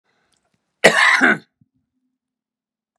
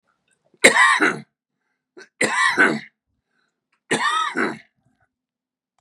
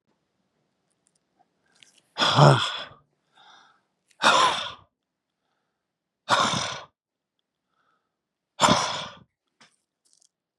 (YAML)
cough_length: 3.0 s
cough_amplitude: 32768
cough_signal_mean_std_ratio: 0.32
three_cough_length: 5.8 s
three_cough_amplitude: 32768
three_cough_signal_mean_std_ratio: 0.4
exhalation_length: 10.6 s
exhalation_amplitude: 25571
exhalation_signal_mean_std_ratio: 0.31
survey_phase: beta (2021-08-13 to 2022-03-07)
age: 45-64
gender: Male
wearing_mask: 'No'
symptom_fatigue: true
symptom_headache: true
smoker_status: Ex-smoker
respiratory_condition_asthma: false
respiratory_condition_other: true
recruitment_source: REACT
submission_delay: 1 day
covid_test_result: Negative
covid_test_method: RT-qPCR
influenza_a_test_result: Unknown/Void
influenza_b_test_result: Unknown/Void